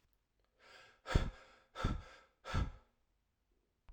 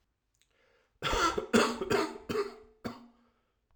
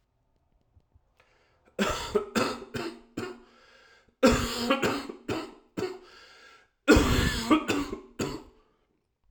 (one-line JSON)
{"exhalation_length": "3.9 s", "exhalation_amplitude": 4760, "exhalation_signal_mean_std_ratio": 0.33, "cough_length": "3.8 s", "cough_amplitude": 9752, "cough_signal_mean_std_ratio": 0.45, "three_cough_length": "9.3 s", "three_cough_amplitude": 16162, "three_cough_signal_mean_std_ratio": 0.44, "survey_phase": "alpha (2021-03-01 to 2021-08-12)", "age": "18-44", "gender": "Male", "wearing_mask": "No", "symptom_cough_any": true, "symptom_new_continuous_cough": true, "symptom_shortness_of_breath": true, "symptom_abdominal_pain": true, "symptom_fever_high_temperature": true, "symptom_headache": true, "symptom_change_to_sense_of_smell_or_taste": true, "symptom_loss_of_taste": true, "symptom_onset": "5 days", "smoker_status": "Never smoked", "respiratory_condition_asthma": false, "respiratory_condition_other": false, "recruitment_source": "Test and Trace", "submission_delay": "1 day", "covid_test_result": "Positive", "covid_test_method": "RT-qPCR", "covid_ct_value": 15.0, "covid_ct_gene": "ORF1ab gene", "covid_ct_mean": 15.4, "covid_viral_load": "9000000 copies/ml", "covid_viral_load_category": "High viral load (>1M copies/ml)"}